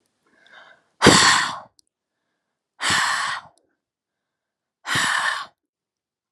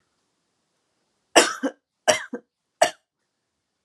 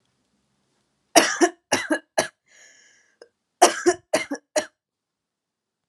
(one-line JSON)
{"exhalation_length": "6.3 s", "exhalation_amplitude": 32768, "exhalation_signal_mean_std_ratio": 0.37, "three_cough_length": "3.8 s", "three_cough_amplitude": 32342, "three_cough_signal_mean_std_ratio": 0.24, "cough_length": "5.9 s", "cough_amplitude": 32767, "cough_signal_mean_std_ratio": 0.29, "survey_phase": "alpha (2021-03-01 to 2021-08-12)", "age": "18-44", "gender": "Female", "wearing_mask": "No", "symptom_none": true, "smoker_status": "Never smoked", "respiratory_condition_asthma": false, "respiratory_condition_other": false, "recruitment_source": "REACT", "submission_delay": "1 day", "covid_test_result": "Negative", "covid_test_method": "RT-qPCR"}